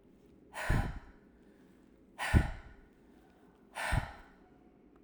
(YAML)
exhalation_length: 5.0 s
exhalation_amplitude: 7320
exhalation_signal_mean_std_ratio: 0.36
survey_phase: alpha (2021-03-01 to 2021-08-12)
age: 18-44
gender: Female
wearing_mask: 'Yes'
symptom_none: true
smoker_status: Never smoked
respiratory_condition_asthma: false
respiratory_condition_other: false
recruitment_source: REACT
submission_delay: 2 days
covid_test_result: Negative
covid_test_method: RT-qPCR